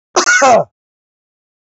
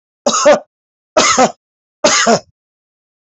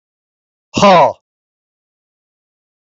{"cough_length": "1.6 s", "cough_amplitude": 32005, "cough_signal_mean_std_ratio": 0.47, "three_cough_length": "3.2 s", "three_cough_amplitude": 31038, "three_cough_signal_mean_std_ratio": 0.47, "exhalation_length": "2.8 s", "exhalation_amplitude": 27907, "exhalation_signal_mean_std_ratio": 0.31, "survey_phase": "beta (2021-08-13 to 2022-03-07)", "age": "45-64", "gender": "Male", "wearing_mask": "No", "symptom_none": true, "smoker_status": "Ex-smoker", "respiratory_condition_asthma": false, "respiratory_condition_other": false, "recruitment_source": "REACT", "submission_delay": "2 days", "covid_test_result": "Negative", "covid_test_method": "RT-qPCR", "influenza_a_test_result": "Negative", "influenza_b_test_result": "Negative"}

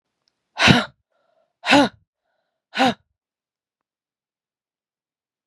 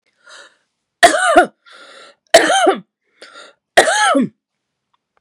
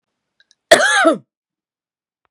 {"exhalation_length": "5.5 s", "exhalation_amplitude": 32768, "exhalation_signal_mean_std_ratio": 0.26, "three_cough_length": "5.2 s", "three_cough_amplitude": 32768, "three_cough_signal_mean_std_ratio": 0.41, "cough_length": "2.3 s", "cough_amplitude": 32768, "cough_signal_mean_std_ratio": 0.34, "survey_phase": "beta (2021-08-13 to 2022-03-07)", "age": "18-44", "gender": "Female", "wearing_mask": "No", "symptom_runny_or_blocked_nose": true, "symptom_sore_throat": true, "symptom_diarrhoea": true, "symptom_fatigue": true, "symptom_headache": true, "smoker_status": "Never smoked", "respiratory_condition_asthma": false, "respiratory_condition_other": false, "recruitment_source": "Test and Trace", "submission_delay": "0 days", "covid_test_result": "Positive", "covid_test_method": "RT-qPCR", "covid_ct_value": 26.5, "covid_ct_gene": "N gene", "covid_ct_mean": 26.6, "covid_viral_load": "1900 copies/ml", "covid_viral_load_category": "Minimal viral load (< 10K copies/ml)"}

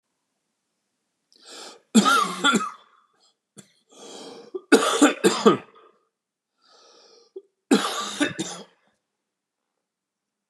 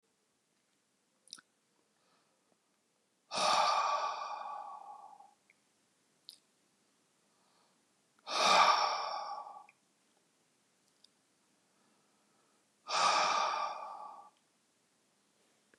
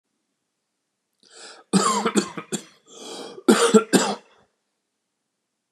{"three_cough_length": "10.5 s", "three_cough_amplitude": 29414, "three_cough_signal_mean_std_ratio": 0.33, "exhalation_length": "15.8 s", "exhalation_amplitude": 6280, "exhalation_signal_mean_std_ratio": 0.36, "cough_length": "5.7 s", "cough_amplitude": 27435, "cough_signal_mean_std_ratio": 0.35, "survey_phase": "beta (2021-08-13 to 2022-03-07)", "age": "45-64", "gender": "Male", "wearing_mask": "No", "symptom_none": true, "smoker_status": "Never smoked", "respiratory_condition_asthma": false, "respiratory_condition_other": false, "recruitment_source": "REACT", "submission_delay": "1 day", "covid_test_result": "Negative", "covid_test_method": "RT-qPCR"}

